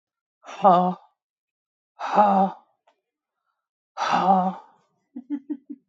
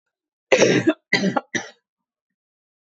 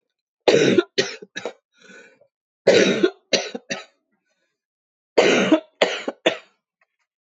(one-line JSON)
{"exhalation_length": "5.9 s", "exhalation_amplitude": 22569, "exhalation_signal_mean_std_ratio": 0.39, "cough_length": "3.0 s", "cough_amplitude": 24603, "cough_signal_mean_std_ratio": 0.37, "three_cough_length": "7.3 s", "three_cough_amplitude": 25268, "three_cough_signal_mean_std_ratio": 0.39, "survey_phase": "beta (2021-08-13 to 2022-03-07)", "age": "45-64", "gender": "Female", "wearing_mask": "No", "symptom_cough_any": true, "symptom_new_continuous_cough": true, "symptom_runny_or_blocked_nose": true, "symptom_shortness_of_breath": true, "symptom_sore_throat": true, "symptom_fatigue": true, "symptom_fever_high_temperature": true, "symptom_headache": true, "symptom_onset": "4 days", "smoker_status": "Never smoked", "respiratory_condition_asthma": false, "respiratory_condition_other": false, "recruitment_source": "Test and Trace", "submission_delay": "2 days", "covid_test_result": "Positive", "covid_test_method": "ePCR"}